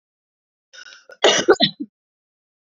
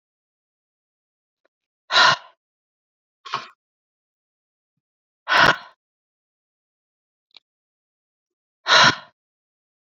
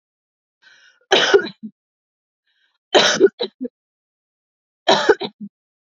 {"cough_length": "2.6 s", "cough_amplitude": 29510, "cough_signal_mean_std_ratio": 0.3, "exhalation_length": "9.9 s", "exhalation_amplitude": 28310, "exhalation_signal_mean_std_ratio": 0.22, "three_cough_length": "5.9 s", "three_cough_amplitude": 32767, "three_cough_signal_mean_std_ratio": 0.32, "survey_phase": "beta (2021-08-13 to 2022-03-07)", "age": "18-44", "gender": "Female", "wearing_mask": "No", "symptom_none": true, "smoker_status": "Never smoked", "respiratory_condition_asthma": true, "respiratory_condition_other": false, "recruitment_source": "REACT", "submission_delay": "2 days", "covid_test_result": "Negative", "covid_test_method": "RT-qPCR", "influenza_a_test_result": "Negative", "influenza_b_test_result": "Negative"}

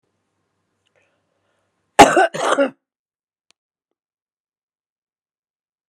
{"cough_length": "5.9 s", "cough_amplitude": 32768, "cough_signal_mean_std_ratio": 0.21, "survey_phase": "beta (2021-08-13 to 2022-03-07)", "age": "65+", "gender": "Female", "wearing_mask": "No", "symptom_none": true, "smoker_status": "Ex-smoker", "respiratory_condition_asthma": false, "respiratory_condition_other": false, "recruitment_source": "REACT", "submission_delay": "3 days", "covid_test_result": "Negative", "covid_test_method": "RT-qPCR", "influenza_a_test_result": "Negative", "influenza_b_test_result": "Negative"}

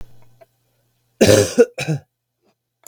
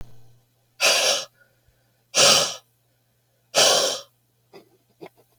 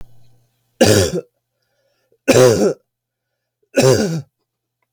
{"cough_length": "2.9 s", "cough_amplitude": 32768, "cough_signal_mean_std_ratio": 0.33, "exhalation_length": "5.4 s", "exhalation_amplitude": 28780, "exhalation_signal_mean_std_ratio": 0.39, "three_cough_length": "4.9 s", "three_cough_amplitude": 32768, "three_cough_signal_mean_std_ratio": 0.4, "survey_phase": "beta (2021-08-13 to 2022-03-07)", "age": "18-44", "gender": "Male", "wearing_mask": "No", "symptom_cough_any": true, "symptom_new_continuous_cough": true, "symptom_runny_or_blocked_nose": true, "symptom_sore_throat": true, "symptom_onset": "9 days", "smoker_status": "Never smoked", "respiratory_condition_asthma": false, "respiratory_condition_other": false, "recruitment_source": "Test and Trace", "submission_delay": "1 day", "covid_test_result": "Negative", "covid_test_method": "RT-qPCR"}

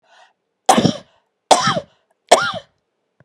{"three_cough_length": "3.2 s", "three_cough_amplitude": 32768, "three_cough_signal_mean_std_ratio": 0.34, "survey_phase": "beta (2021-08-13 to 2022-03-07)", "age": "45-64", "gender": "Female", "wearing_mask": "Yes", "symptom_none": true, "smoker_status": "Never smoked", "respiratory_condition_asthma": false, "respiratory_condition_other": false, "recruitment_source": "REACT", "submission_delay": "3 days", "covid_test_result": "Negative", "covid_test_method": "RT-qPCR", "influenza_a_test_result": "Negative", "influenza_b_test_result": "Negative"}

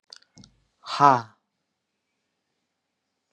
{"exhalation_length": "3.3 s", "exhalation_amplitude": 26735, "exhalation_signal_mean_std_ratio": 0.19, "survey_phase": "beta (2021-08-13 to 2022-03-07)", "age": "18-44", "gender": "Male", "wearing_mask": "No", "symptom_none": true, "smoker_status": "Current smoker (1 to 10 cigarettes per day)", "respiratory_condition_asthma": false, "respiratory_condition_other": false, "recruitment_source": "REACT", "submission_delay": "1 day", "covid_test_result": "Negative", "covid_test_method": "RT-qPCR", "influenza_a_test_result": "Unknown/Void", "influenza_b_test_result": "Unknown/Void"}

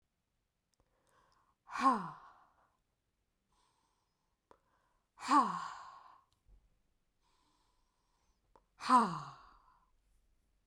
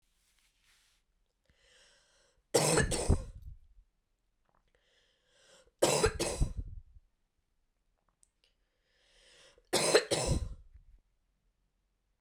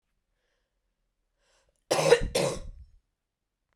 {"exhalation_length": "10.7 s", "exhalation_amplitude": 5550, "exhalation_signal_mean_std_ratio": 0.24, "three_cough_length": "12.2 s", "three_cough_amplitude": 12901, "three_cough_signal_mean_std_ratio": 0.32, "cough_length": "3.8 s", "cough_amplitude": 14850, "cough_signal_mean_std_ratio": 0.3, "survey_phase": "beta (2021-08-13 to 2022-03-07)", "age": "18-44", "gender": "Female", "wearing_mask": "No", "symptom_runny_or_blocked_nose": true, "symptom_headache": true, "symptom_onset": "4 days", "smoker_status": "Never smoked", "respiratory_condition_asthma": false, "respiratory_condition_other": false, "recruitment_source": "REACT", "submission_delay": "1 day", "covid_test_result": "Negative", "covid_test_method": "RT-qPCR"}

